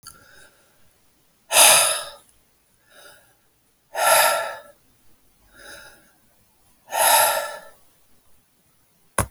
exhalation_length: 9.3 s
exhalation_amplitude: 32768
exhalation_signal_mean_std_ratio: 0.34
survey_phase: beta (2021-08-13 to 2022-03-07)
age: 45-64
gender: Male
wearing_mask: 'No'
symptom_none: true
smoker_status: Never smoked
respiratory_condition_asthma: false
respiratory_condition_other: false
recruitment_source: REACT
submission_delay: 6 days
covid_test_result: Negative
covid_test_method: RT-qPCR
influenza_a_test_result: Negative
influenza_b_test_result: Negative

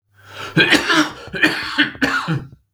cough_length: 2.7 s
cough_amplitude: 32767
cough_signal_mean_std_ratio: 0.62
survey_phase: beta (2021-08-13 to 2022-03-07)
age: 45-64
gender: Male
wearing_mask: 'No'
symptom_cough_any: true
symptom_fatigue: true
symptom_onset: 3 days
smoker_status: Never smoked
respiratory_condition_asthma: true
respiratory_condition_other: false
recruitment_source: Test and Trace
submission_delay: 1 day
covid_test_result: Positive
covid_test_method: RT-qPCR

